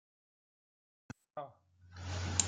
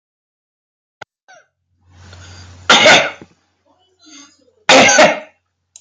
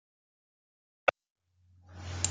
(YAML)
exhalation_length: 2.5 s
exhalation_amplitude: 9263
exhalation_signal_mean_std_ratio: 0.37
three_cough_length: 5.8 s
three_cough_amplitude: 32768
three_cough_signal_mean_std_ratio: 0.35
cough_length: 2.3 s
cough_amplitude: 14937
cough_signal_mean_std_ratio: 0.2
survey_phase: beta (2021-08-13 to 2022-03-07)
age: 45-64
gender: Male
wearing_mask: 'No'
symptom_none: true
smoker_status: Never smoked
respiratory_condition_asthma: false
respiratory_condition_other: false
recruitment_source: REACT
submission_delay: 4 days
covid_test_result: Negative
covid_test_method: RT-qPCR
influenza_a_test_result: Negative
influenza_b_test_result: Negative